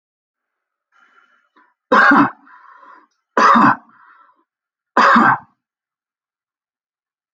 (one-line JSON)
{"three_cough_length": "7.3 s", "three_cough_amplitude": 32150, "three_cough_signal_mean_std_ratio": 0.34, "survey_phase": "alpha (2021-03-01 to 2021-08-12)", "age": "45-64", "gender": "Male", "wearing_mask": "No", "symptom_none": true, "smoker_status": "Never smoked", "respiratory_condition_asthma": false, "respiratory_condition_other": false, "recruitment_source": "REACT", "submission_delay": "2 days", "covid_test_result": "Negative", "covid_test_method": "RT-qPCR"}